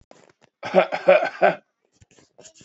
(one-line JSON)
{"three_cough_length": "2.6 s", "three_cough_amplitude": 27927, "three_cough_signal_mean_std_ratio": 0.36, "survey_phase": "beta (2021-08-13 to 2022-03-07)", "age": "18-44", "gender": "Male", "wearing_mask": "No", "symptom_none": true, "smoker_status": "Current smoker (1 to 10 cigarettes per day)", "respiratory_condition_asthma": false, "respiratory_condition_other": false, "recruitment_source": "REACT", "submission_delay": "2 days", "covid_test_result": "Negative", "covid_test_method": "RT-qPCR"}